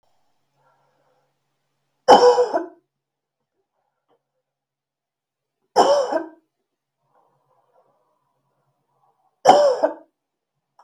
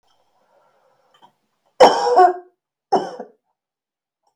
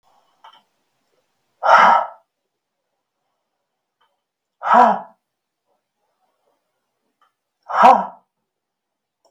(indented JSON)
{
  "three_cough_length": "10.8 s",
  "three_cough_amplitude": 32768,
  "three_cough_signal_mean_std_ratio": 0.27,
  "cough_length": "4.4 s",
  "cough_amplitude": 32768,
  "cough_signal_mean_std_ratio": 0.29,
  "exhalation_length": "9.3 s",
  "exhalation_amplitude": 32768,
  "exhalation_signal_mean_std_ratio": 0.26,
  "survey_phase": "beta (2021-08-13 to 2022-03-07)",
  "age": "18-44",
  "gender": "Female",
  "wearing_mask": "No",
  "symptom_none": true,
  "symptom_onset": "7 days",
  "smoker_status": "Never smoked",
  "respiratory_condition_asthma": false,
  "respiratory_condition_other": false,
  "recruitment_source": "REACT",
  "submission_delay": "3 days",
  "covid_test_result": "Negative",
  "covid_test_method": "RT-qPCR",
  "influenza_a_test_result": "Negative",
  "influenza_b_test_result": "Negative"
}